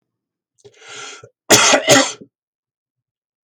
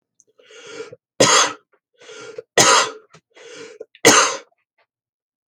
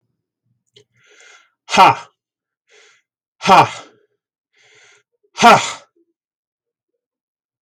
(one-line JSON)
{"cough_length": "3.4 s", "cough_amplitude": 32768, "cough_signal_mean_std_ratio": 0.34, "three_cough_length": "5.5 s", "three_cough_amplitude": 32767, "three_cough_signal_mean_std_ratio": 0.35, "exhalation_length": "7.6 s", "exhalation_amplitude": 32768, "exhalation_signal_mean_std_ratio": 0.25, "survey_phase": "beta (2021-08-13 to 2022-03-07)", "age": "45-64", "gender": "Male", "wearing_mask": "No", "symptom_none": true, "smoker_status": "Never smoked", "respiratory_condition_asthma": false, "respiratory_condition_other": false, "recruitment_source": "REACT", "submission_delay": "1 day", "covid_test_result": "Negative", "covid_test_method": "RT-qPCR"}